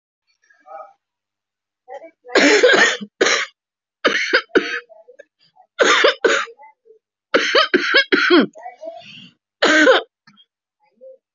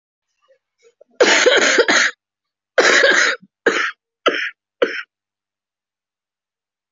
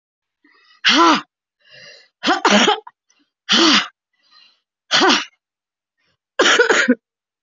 {
  "three_cough_length": "11.3 s",
  "three_cough_amplitude": 32540,
  "three_cough_signal_mean_std_ratio": 0.45,
  "cough_length": "6.9 s",
  "cough_amplitude": 31079,
  "cough_signal_mean_std_ratio": 0.44,
  "exhalation_length": "7.4 s",
  "exhalation_amplitude": 30521,
  "exhalation_signal_mean_std_ratio": 0.44,
  "survey_phase": "beta (2021-08-13 to 2022-03-07)",
  "age": "18-44",
  "gender": "Female",
  "wearing_mask": "Yes",
  "symptom_cough_any": true,
  "symptom_fatigue": true,
  "symptom_headache": true,
  "symptom_loss_of_taste": true,
  "symptom_onset": "5 days",
  "smoker_status": "Never smoked",
  "respiratory_condition_asthma": false,
  "respiratory_condition_other": false,
  "recruitment_source": "Test and Trace",
  "submission_delay": "2 days",
  "covid_test_result": "Positive",
  "covid_test_method": "ePCR"
}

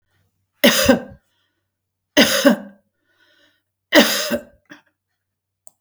{
  "three_cough_length": "5.8 s",
  "three_cough_amplitude": 32768,
  "three_cough_signal_mean_std_ratio": 0.34,
  "survey_phase": "beta (2021-08-13 to 2022-03-07)",
  "age": "65+",
  "gender": "Female",
  "wearing_mask": "No",
  "symptom_new_continuous_cough": true,
  "symptom_sore_throat": true,
  "symptom_onset": "12 days",
  "smoker_status": "Ex-smoker",
  "respiratory_condition_asthma": false,
  "respiratory_condition_other": false,
  "recruitment_source": "REACT",
  "submission_delay": "3 days",
  "covid_test_result": "Negative",
  "covid_test_method": "RT-qPCR",
  "influenza_a_test_result": "Negative",
  "influenza_b_test_result": "Negative"
}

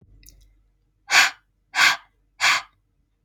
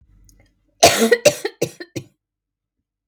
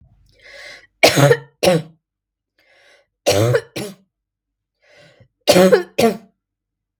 {
  "exhalation_length": "3.2 s",
  "exhalation_amplitude": 27010,
  "exhalation_signal_mean_std_ratio": 0.34,
  "cough_length": "3.1 s",
  "cough_amplitude": 32768,
  "cough_signal_mean_std_ratio": 0.31,
  "three_cough_length": "7.0 s",
  "three_cough_amplitude": 32768,
  "three_cough_signal_mean_std_ratio": 0.36,
  "survey_phase": "beta (2021-08-13 to 2022-03-07)",
  "age": "18-44",
  "gender": "Female",
  "wearing_mask": "No",
  "symptom_runny_or_blocked_nose": true,
  "smoker_status": "Ex-smoker",
  "respiratory_condition_asthma": false,
  "respiratory_condition_other": false,
  "recruitment_source": "REACT",
  "submission_delay": "3 days",
  "covid_test_result": "Negative",
  "covid_test_method": "RT-qPCR",
  "influenza_a_test_result": "Negative",
  "influenza_b_test_result": "Negative"
}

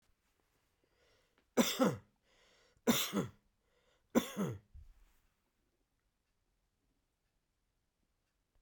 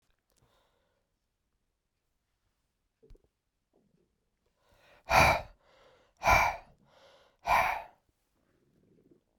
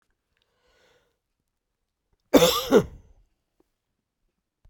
{
  "three_cough_length": "8.6 s",
  "three_cough_amplitude": 5541,
  "three_cough_signal_mean_std_ratio": 0.26,
  "exhalation_length": "9.4 s",
  "exhalation_amplitude": 12472,
  "exhalation_signal_mean_std_ratio": 0.25,
  "cough_length": "4.7 s",
  "cough_amplitude": 25442,
  "cough_signal_mean_std_ratio": 0.23,
  "survey_phase": "beta (2021-08-13 to 2022-03-07)",
  "age": "65+",
  "gender": "Male",
  "wearing_mask": "No",
  "symptom_none": true,
  "smoker_status": "Never smoked",
  "respiratory_condition_asthma": false,
  "respiratory_condition_other": false,
  "recruitment_source": "REACT",
  "submission_delay": "2 days",
  "covid_test_result": "Negative",
  "covid_test_method": "RT-qPCR"
}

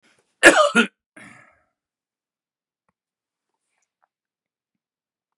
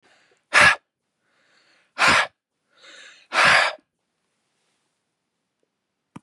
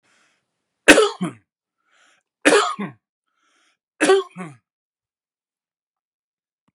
{
  "cough_length": "5.4 s",
  "cough_amplitude": 32768,
  "cough_signal_mean_std_ratio": 0.19,
  "exhalation_length": "6.2 s",
  "exhalation_amplitude": 26881,
  "exhalation_signal_mean_std_ratio": 0.3,
  "three_cough_length": "6.7 s",
  "three_cough_amplitude": 32768,
  "three_cough_signal_mean_std_ratio": 0.27,
  "survey_phase": "beta (2021-08-13 to 2022-03-07)",
  "age": "45-64",
  "gender": "Male",
  "wearing_mask": "No",
  "symptom_none": true,
  "smoker_status": "Ex-smoker",
  "respiratory_condition_asthma": false,
  "respiratory_condition_other": false,
  "recruitment_source": "REACT",
  "submission_delay": "1 day",
  "covid_test_result": "Negative",
  "covid_test_method": "RT-qPCR",
  "influenza_a_test_result": "Unknown/Void",
  "influenza_b_test_result": "Unknown/Void"
}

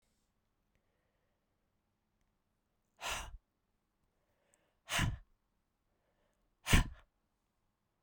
{
  "exhalation_length": "8.0 s",
  "exhalation_amplitude": 8332,
  "exhalation_signal_mean_std_ratio": 0.2,
  "survey_phase": "beta (2021-08-13 to 2022-03-07)",
  "age": "45-64",
  "gender": "Female",
  "wearing_mask": "No",
  "symptom_cough_any": true,
  "symptom_runny_or_blocked_nose": true,
  "symptom_fatigue": true,
  "symptom_fever_high_temperature": true,
  "symptom_change_to_sense_of_smell_or_taste": true,
  "symptom_loss_of_taste": true,
  "symptom_onset": "5 days",
  "smoker_status": "Never smoked",
  "respiratory_condition_asthma": false,
  "respiratory_condition_other": false,
  "recruitment_source": "Test and Trace",
  "submission_delay": "2 days",
  "covid_test_result": "Positive",
  "covid_test_method": "RT-qPCR",
  "covid_ct_value": 16.5,
  "covid_ct_gene": "ORF1ab gene",
  "covid_ct_mean": 17.3,
  "covid_viral_load": "2200000 copies/ml",
  "covid_viral_load_category": "High viral load (>1M copies/ml)"
}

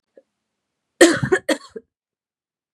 {
  "cough_length": "2.7 s",
  "cough_amplitude": 32768,
  "cough_signal_mean_std_ratio": 0.27,
  "survey_phase": "beta (2021-08-13 to 2022-03-07)",
  "age": "45-64",
  "gender": "Female",
  "wearing_mask": "No",
  "symptom_cough_any": true,
  "symptom_sore_throat": true,
  "symptom_headache": true,
  "symptom_onset": "5 days",
  "smoker_status": "Ex-smoker",
  "respiratory_condition_asthma": false,
  "respiratory_condition_other": false,
  "recruitment_source": "Test and Trace",
  "submission_delay": "2 days",
  "covid_test_result": "Positive",
  "covid_test_method": "RT-qPCR",
  "covid_ct_value": 19.9,
  "covid_ct_gene": "N gene"
}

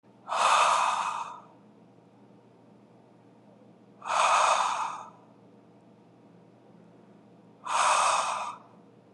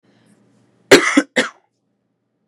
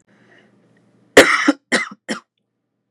{
  "exhalation_length": "9.1 s",
  "exhalation_amplitude": 9791,
  "exhalation_signal_mean_std_ratio": 0.48,
  "cough_length": "2.5 s",
  "cough_amplitude": 32768,
  "cough_signal_mean_std_ratio": 0.27,
  "three_cough_length": "2.9 s",
  "three_cough_amplitude": 32768,
  "three_cough_signal_mean_std_ratio": 0.29,
  "survey_phase": "beta (2021-08-13 to 2022-03-07)",
  "age": "18-44",
  "gender": "Male",
  "wearing_mask": "No",
  "symptom_cough_any": true,
  "symptom_sore_throat": true,
  "symptom_onset": "5 days",
  "smoker_status": "Never smoked",
  "respiratory_condition_asthma": false,
  "respiratory_condition_other": false,
  "recruitment_source": "REACT",
  "submission_delay": "2 days",
  "covid_test_result": "Negative",
  "covid_test_method": "RT-qPCR"
}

